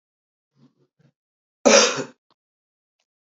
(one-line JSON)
{"cough_length": "3.2 s", "cough_amplitude": 30153, "cough_signal_mean_std_ratio": 0.24, "survey_phase": "beta (2021-08-13 to 2022-03-07)", "age": "45-64", "gender": "Female", "wearing_mask": "No", "symptom_cough_any": true, "symptom_runny_or_blocked_nose": true, "symptom_fatigue": true, "symptom_onset": "4 days", "smoker_status": "Current smoker (1 to 10 cigarettes per day)", "respiratory_condition_asthma": false, "respiratory_condition_other": false, "recruitment_source": "Test and Trace", "submission_delay": "2 days", "covid_test_result": "Positive", "covid_test_method": "ePCR"}